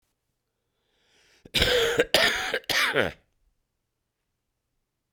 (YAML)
cough_length: 5.1 s
cough_amplitude: 24211
cough_signal_mean_std_ratio: 0.4
survey_phase: beta (2021-08-13 to 2022-03-07)
age: 45-64
gender: Male
wearing_mask: 'No'
symptom_cough_any: true
symptom_sore_throat: true
symptom_abdominal_pain: true
symptom_diarrhoea: true
symptom_fatigue: true
symptom_fever_high_temperature: true
symptom_headache: true
symptom_change_to_sense_of_smell_or_taste: true
symptom_loss_of_taste: true
symptom_onset: 4 days
smoker_status: Ex-smoker
respiratory_condition_asthma: false
respiratory_condition_other: false
recruitment_source: Test and Trace
submission_delay: 2 days
covid_test_result: Positive
covid_test_method: RT-qPCR
covid_ct_value: 12.0
covid_ct_gene: ORF1ab gene